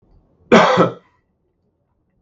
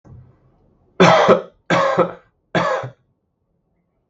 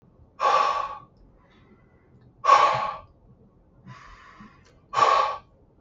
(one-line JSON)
{"cough_length": "2.2 s", "cough_amplitude": 32768, "cough_signal_mean_std_ratio": 0.34, "three_cough_length": "4.1 s", "three_cough_amplitude": 32768, "three_cough_signal_mean_std_ratio": 0.41, "exhalation_length": "5.8 s", "exhalation_amplitude": 20632, "exhalation_signal_mean_std_ratio": 0.41, "survey_phase": "beta (2021-08-13 to 2022-03-07)", "age": "18-44", "gender": "Male", "wearing_mask": "No", "symptom_runny_or_blocked_nose": true, "smoker_status": "Current smoker (e-cigarettes or vapes only)", "respiratory_condition_asthma": false, "respiratory_condition_other": false, "recruitment_source": "REACT", "submission_delay": "3 days", "covid_test_result": "Negative", "covid_test_method": "RT-qPCR"}